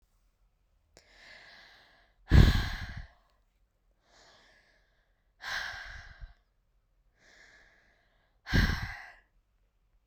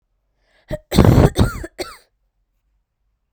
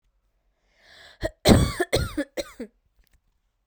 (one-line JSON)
{"exhalation_length": "10.1 s", "exhalation_amplitude": 14850, "exhalation_signal_mean_std_ratio": 0.24, "cough_length": "3.3 s", "cough_amplitude": 32768, "cough_signal_mean_std_ratio": 0.32, "three_cough_length": "3.7 s", "three_cough_amplitude": 32768, "three_cough_signal_mean_std_ratio": 0.31, "survey_phase": "beta (2021-08-13 to 2022-03-07)", "age": "18-44", "gender": "Female", "wearing_mask": "No", "symptom_cough_any": true, "symptom_runny_or_blocked_nose": true, "symptom_shortness_of_breath": true, "symptom_fatigue": true, "symptom_change_to_sense_of_smell_or_taste": true, "smoker_status": "Never smoked", "respiratory_condition_asthma": false, "respiratory_condition_other": false, "recruitment_source": "Test and Trace", "submission_delay": "2 days", "covid_test_result": "Positive", "covid_test_method": "RT-qPCR", "covid_ct_value": 19.5, "covid_ct_gene": "N gene"}